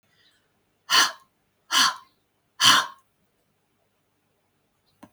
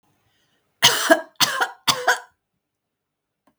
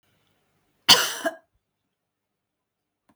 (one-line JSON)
{"exhalation_length": "5.1 s", "exhalation_amplitude": 25912, "exhalation_signal_mean_std_ratio": 0.28, "three_cough_length": "3.6 s", "three_cough_amplitude": 32766, "three_cough_signal_mean_std_ratio": 0.35, "cough_length": "3.2 s", "cough_amplitude": 32767, "cough_signal_mean_std_ratio": 0.2, "survey_phase": "beta (2021-08-13 to 2022-03-07)", "age": "45-64", "gender": "Female", "wearing_mask": "No", "symptom_none": true, "symptom_onset": "12 days", "smoker_status": "Never smoked", "respiratory_condition_asthma": true, "respiratory_condition_other": false, "recruitment_source": "REACT", "submission_delay": "1 day", "covid_test_result": "Negative", "covid_test_method": "RT-qPCR", "influenza_a_test_result": "Negative", "influenza_b_test_result": "Negative"}